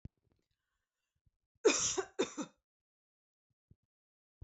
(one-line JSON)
{"cough_length": "4.4 s", "cough_amplitude": 4870, "cough_signal_mean_std_ratio": 0.25, "survey_phase": "beta (2021-08-13 to 2022-03-07)", "age": "18-44", "gender": "Female", "wearing_mask": "No", "symptom_none": true, "smoker_status": "Never smoked", "respiratory_condition_asthma": false, "respiratory_condition_other": false, "recruitment_source": "REACT", "submission_delay": "2 days", "covid_test_result": "Negative", "covid_test_method": "RT-qPCR", "influenza_a_test_result": "Negative", "influenza_b_test_result": "Negative"}